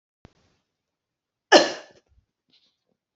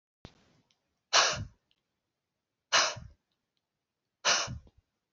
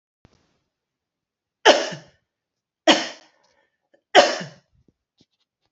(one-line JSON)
{"cough_length": "3.2 s", "cough_amplitude": 30016, "cough_signal_mean_std_ratio": 0.17, "exhalation_length": "5.1 s", "exhalation_amplitude": 12231, "exhalation_signal_mean_std_ratio": 0.3, "three_cough_length": "5.7 s", "three_cough_amplitude": 30998, "three_cough_signal_mean_std_ratio": 0.23, "survey_phase": "beta (2021-08-13 to 2022-03-07)", "age": "45-64", "gender": "Female", "wearing_mask": "No", "symptom_cough_any": true, "symptom_runny_or_blocked_nose": true, "symptom_sore_throat": true, "symptom_onset": "7 days", "smoker_status": "Never smoked", "respiratory_condition_asthma": false, "respiratory_condition_other": false, "recruitment_source": "REACT", "submission_delay": "1 day", "covid_test_result": "Negative", "covid_test_method": "RT-qPCR"}